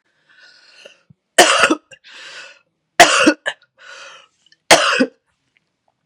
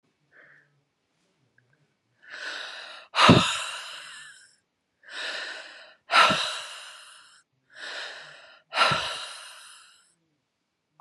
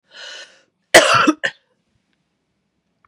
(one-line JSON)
{"three_cough_length": "6.1 s", "three_cough_amplitude": 32768, "three_cough_signal_mean_std_ratio": 0.33, "exhalation_length": "11.0 s", "exhalation_amplitude": 24563, "exhalation_signal_mean_std_ratio": 0.33, "cough_length": "3.1 s", "cough_amplitude": 32768, "cough_signal_mean_std_ratio": 0.29, "survey_phase": "beta (2021-08-13 to 2022-03-07)", "age": "45-64", "gender": "Female", "wearing_mask": "No", "symptom_cough_any": true, "symptom_runny_or_blocked_nose": true, "symptom_fatigue": true, "symptom_headache": true, "symptom_change_to_sense_of_smell_or_taste": true, "symptom_other": true, "symptom_onset": "5 days", "smoker_status": "Never smoked", "respiratory_condition_asthma": false, "respiratory_condition_other": false, "recruitment_source": "Test and Trace", "submission_delay": "1 day", "covid_test_result": "Positive", "covid_test_method": "RT-qPCR"}